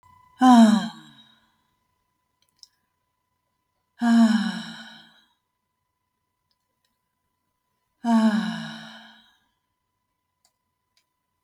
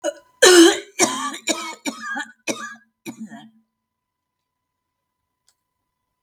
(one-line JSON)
{"exhalation_length": "11.4 s", "exhalation_amplitude": 21502, "exhalation_signal_mean_std_ratio": 0.3, "cough_length": "6.2 s", "cough_amplitude": 32768, "cough_signal_mean_std_ratio": 0.31, "survey_phase": "beta (2021-08-13 to 2022-03-07)", "age": "65+", "gender": "Female", "wearing_mask": "No", "symptom_none": true, "smoker_status": "Never smoked", "respiratory_condition_asthma": false, "respiratory_condition_other": false, "recruitment_source": "REACT", "submission_delay": "3 days", "covid_test_result": "Negative", "covid_test_method": "RT-qPCR", "influenza_a_test_result": "Negative", "influenza_b_test_result": "Negative"}